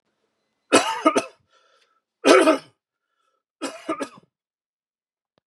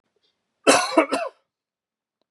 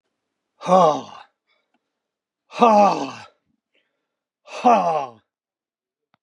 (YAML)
three_cough_length: 5.5 s
three_cough_amplitude: 31312
three_cough_signal_mean_std_ratio: 0.3
cough_length: 2.3 s
cough_amplitude: 30009
cough_signal_mean_std_ratio: 0.33
exhalation_length: 6.2 s
exhalation_amplitude: 31236
exhalation_signal_mean_std_ratio: 0.35
survey_phase: beta (2021-08-13 to 2022-03-07)
age: 45-64
gender: Male
wearing_mask: 'No'
symptom_cough_any: true
smoker_status: Never smoked
respiratory_condition_asthma: false
respiratory_condition_other: false
recruitment_source: Test and Trace
submission_delay: 2 days
covid_test_result: Positive
covid_test_method: RT-qPCR
covid_ct_value: 21.3
covid_ct_gene: N gene